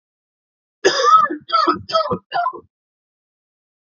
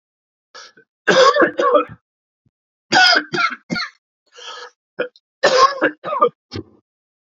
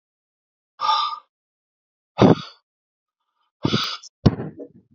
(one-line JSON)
{"cough_length": "3.9 s", "cough_amplitude": 27121, "cough_signal_mean_std_ratio": 0.44, "three_cough_length": "7.3 s", "three_cough_amplitude": 30742, "three_cough_signal_mean_std_ratio": 0.43, "exhalation_length": "4.9 s", "exhalation_amplitude": 32767, "exhalation_signal_mean_std_ratio": 0.3, "survey_phase": "beta (2021-08-13 to 2022-03-07)", "age": "18-44", "gender": "Male", "wearing_mask": "No", "symptom_cough_any": true, "symptom_runny_or_blocked_nose": true, "symptom_headache": true, "smoker_status": "Ex-smoker", "respiratory_condition_asthma": false, "respiratory_condition_other": false, "recruitment_source": "Test and Trace", "submission_delay": "2 days", "covid_test_result": "Positive", "covid_test_method": "LFT"}